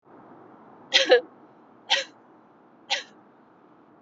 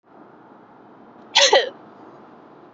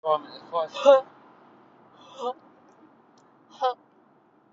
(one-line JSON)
{"three_cough_length": "4.0 s", "three_cough_amplitude": 24365, "three_cough_signal_mean_std_ratio": 0.29, "cough_length": "2.7 s", "cough_amplitude": 27290, "cough_signal_mean_std_ratio": 0.31, "exhalation_length": "4.5 s", "exhalation_amplitude": 20917, "exhalation_signal_mean_std_ratio": 0.3, "survey_phase": "beta (2021-08-13 to 2022-03-07)", "age": "18-44", "gender": "Female", "wearing_mask": "No", "symptom_runny_or_blocked_nose": true, "symptom_onset": "6 days", "smoker_status": "Never smoked", "respiratory_condition_asthma": false, "respiratory_condition_other": false, "recruitment_source": "REACT", "submission_delay": "1 day", "covid_test_result": "Negative", "covid_test_method": "RT-qPCR"}